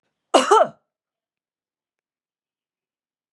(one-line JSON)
{"cough_length": "3.3 s", "cough_amplitude": 32186, "cough_signal_mean_std_ratio": 0.22, "survey_phase": "beta (2021-08-13 to 2022-03-07)", "age": "65+", "gender": "Female", "wearing_mask": "No", "symptom_none": true, "smoker_status": "Never smoked", "respiratory_condition_asthma": false, "respiratory_condition_other": false, "recruitment_source": "REACT", "submission_delay": "1 day", "covid_test_result": "Negative", "covid_test_method": "RT-qPCR", "influenza_a_test_result": "Negative", "influenza_b_test_result": "Negative"}